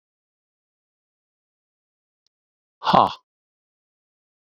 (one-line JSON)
{"exhalation_length": "4.4 s", "exhalation_amplitude": 27129, "exhalation_signal_mean_std_ratio": 0.16, "survey_phase": "beta (2021-08-13 to 2022-03-07)", "age": "45-64", "gender": "Male", "wearing_mask": "No", "symptom_cough_any": true, "symptom_headache": true, "symptom_onset": "5 days", "smoker_status": "Never smoked", "respiratory_condition_asthma": false, "respiratory_condition_other": false, "recruitment_source": "Test and Trace", "submission_delay": "1 day", "covid_test_result": "Positive", "covid_test_method": "RT-qPCR"}